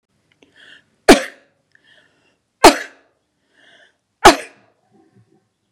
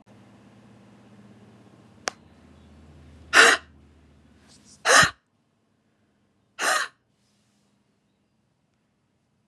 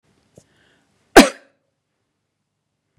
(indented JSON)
{
  "three_cough_length": "5.7 s",
  "three_cough_amplitude": 32768,
  "three_cough_signal_mean_std_ratio": 0.2,
  "exhalation_length": "9.5 s",
  "exhalation_amplitude": 29767,
  "exhalation_signal_mean_std_ratio": 0.23,
  "cough_length": "3.0 s",
  "cough_amplitude": 32768,
  "cough_signal_mean_std_ratio": 0.15,
  "survey_phase": "beta (2021-08-13 to 2022-03-07)",
  "age": "45-64",
  "gender": "Female",
  "wearing_mask": "No",
  "symptom_none": true,
  "smoker_status": "Ex-smoker",
  "respiratory_condition_asthma": false,
  "respiratory_condition_other": false,
  "recruitment_source": "REACT",
  "submission_delay": "1 day",
  "covid_test_result": "Negative",
  "covid_test_method": "RT-qPCR",
  "influenza_a_test_result": "Negative",
  "influenza_b_test_result": "Negative"
}